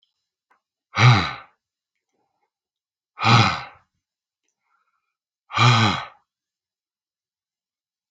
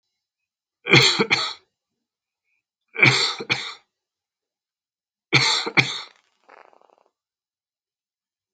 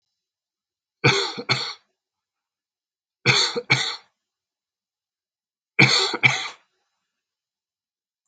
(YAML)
exhalation_length: 8.1 s
exhalation_amplitude: 27626
exhalation_signal_mean_std_ratio: 0.3
three_cough_length: 8.5 s
three_cough_amplitude: 28854
three_cough_signal_mean_std_ratio: 0.31
cough_length: 8.3 s
cough_amplitude: 27745
cough_signal_mean_std_ratio: 0.32
survey_phase: alpha (2021-03-01 to 2021-08-12)
age: 65+
gender: Male
wearing_mask: 'No'
symptom_none: true
smoker_status: Never smoked
respiratory_condition_asthma: false
respiratory_condition_other: false
recruitment_source: REACT
submission_delay: 1 day
covid_test_result: Negative
covid_test_method: RT-qPCR